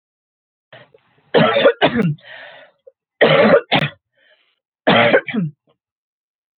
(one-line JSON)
{"three_cough_length": "6.6 s", "three_cough_amplitude": 30533, "three_cough_signal_mean_std_ratio": 0.43, "survey_phase": "beta (2021-08-13 to 2022-03-07)", "age": "45-64", "gender": "Female", "wearing_mask": "No", "symptom_cough_any": true, "symptom_runny_or_blocked_nose": true, "symptom_sore_throat": true, "symptom_headache": true, "symptom_onset": "5 days", "smoker_status": "Never smoked", "respiratory_condition_asthma": false, "respiratory_condition_other": false, "recruitment_source": "Test and Trace", "submission_delay": "1 day", "covid_test_result": "Positive", "covid_test_method": "RT-qPCR"}